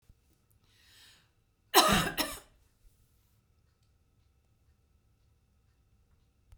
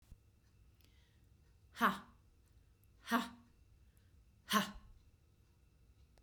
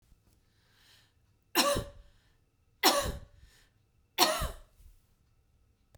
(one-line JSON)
{"cough_length": "6.6 s", "cough_amplitude": 14759, "cough_signal_mean_std_ratio": 0.22, "exhalation_length": "6.2 s", "exhalation_amplitude": 4097, "exhalation_signal_mean_std_ratio": 0.28, "three_cough_length": "6.0 s", "three_cough_amplitude": 15037, "three_cough_signal_mean_std_ratio": 0.31, "survey_phase": "beta (2021-08-13 to 2022-03-07)", "age": "65+", "gender": "Female", "wearing_mask": "No", "symptom_none": true, "smoker_status": "Ex-smoker", "respiratory_condition_asthma": false, "respiratory_condition_other": false, "recruitment_source": "REACT", "submission_delay": "1 day", "covid_test_result": "Negative", "covid_test_method": "RT-qPCR"}